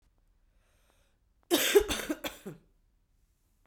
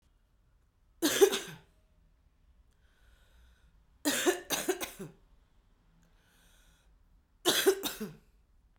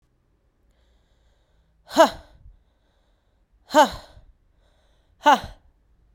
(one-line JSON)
{"cough_length": "3.7 s", "cough_amplitude": 10778, "cough_signal_mean_std_ratio": 0.3, "three_cough_length": "8.8 s", "three_cough_amplitude": 12006, "three_cough_signal_mean_std_ratio": 0.32, "exhalation_length": "6.1 s", "exhalation_amplitude": 29237, "exhalation_signal_mean_std_ratio": 0.22, "survey_phase": "beta (2021-08-13 to 2022-03-07)", "age": "18-44", "gender": "Female", "wearing_mask": "No", "symptom_cough_any": true, "symptom_runny_or_blocked_nose": true, "symptom_sore_throat": true, "symptom_fatigue": true, "symptom_fever_high_temperature": true, "symptom_onset": "4 days", "smoker_status": "Ex-smoker", "respiratory_condition_asthma": false, "respiratory_condition_other": false, "recruitment_source": "Test and Trace", "submission_delay": "1 day", "covid_test_result": "Positive", "covid_test_method": "RT-qPCR"}